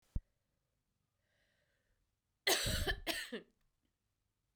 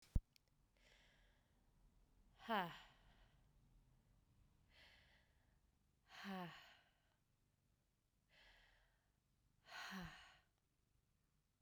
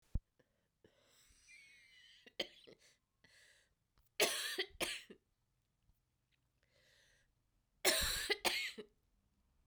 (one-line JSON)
{"cough_length": "4.6 s", "cough_amplitude": 3856, "cough_signal_mean_std_ratio": 0.32, "exhalation_length": "11.6 s", "exhalation_amplitude": 1983, "exhalation_signal_mean_std_ratio": 0.25, "three_cough_length": "9.7 s", "three_cough_amplitude": 4837, "three_cough_signal_mean_std_ratio": 0.31, "survey_phase": "beta (2021-08-13 to 2022-03-07)", "age": "45-64", "gender": "Female", "wearing_mask": "No", "symptom_cough_any": true, "symptom_runny_or_blocked_nose": true, "symptom_headache": true, "symptom_change_to_sense_of_smell_or_taste": true, "smoker_status": "Never smoked", "respiratory_condition_asthma": false, "respiratory_condition_other": false, "recruitment_source": "Test and Trace", "submission_delay": "2 days", "covid_test_result": "Positive", "covid_test_method": "RT-qPCR", "covid_ct_value": 26.2, "covid_ct_gene": "ORF1ab gene", "covid_ct_mean": 26.8, "covid_viral_load": "1600 copies/ml", "covid_viral_load_category": "Minimal viral load (< 10K copies/ml)"}